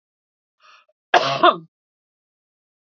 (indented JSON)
{
  "cough_length": "2.9 s",
  "cough_amplitude": 30488,
  "cough_signal_mean_std_ratio": 0.25,
  "survey_phase": "beta (2021-08-13 to 2022-03-07)",
  "age": "45-64",
  "gender": "Female",
  "wearing_mask": "No",
  "symptom_none": true,
  "smoker_status": "Ex-smoker",
  "respiratory_condition_asthma": false,
  "respiratory_condition_other": false,
  "recruitment_source": "Test and Trace",
  "submission_delay": "1 day",
  "covid_test_result": "Positive",
  "covid_test_method": "LFT"
}